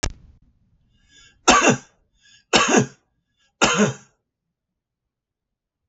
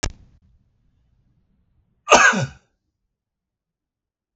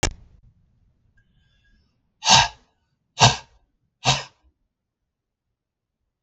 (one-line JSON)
{"three_cough_length": "5.9 s", "three_cough_amplitude": 32768, "three_cough_signal_mean_std_ratio": 0.32, "cough_length": "4.4 s", "cough_amplitude": 32768, "cough_signal_mean_std_ratio": 0.23, "exhalation_length": "6.2 s", "exhalation_amplitude": 32768, "exhalation_signal_mean_std_ratio": 0.23, "survey_phase": "beta (2021-08-13 to 2022-03-07)", "age": "65+", "gender": "Male", "wearing_mask": "No", "symptom_none": true, "smoker_status": "Ex-smoker", "respiratory_condition_asthma": false, "respiratory_condition_other": false, "recruitment_source": "REACT", "submission_delay": "38 days", "covid_test_result": "Negative", "covid_test_method": "RT-qPCR", "influenza_a_test_result": "Negative", "influenza_b_test_result": "Negative"}